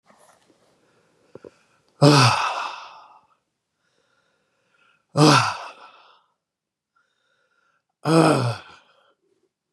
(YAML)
exhalation_length: 9.7 s
exhalation_amplitude: 29518
exhalation_signal_mean_std_ratio: 0.31
survey_phase: beta (2021-08-13 to 2022-03-07)
age: 45-64
gender: Male
wearing_mask: 'No'
symptom_none: true
smoker_status: Never smoked
respiratory_condition_asthma: false
respiratory_condition_other: false
recruitment_source: REACT
submission_delay: 1 day
covid_test_result: Negative
covid_test_method: RT-qPCR
influenza_a_test_result: Negative
influenza_b_test_result: Negative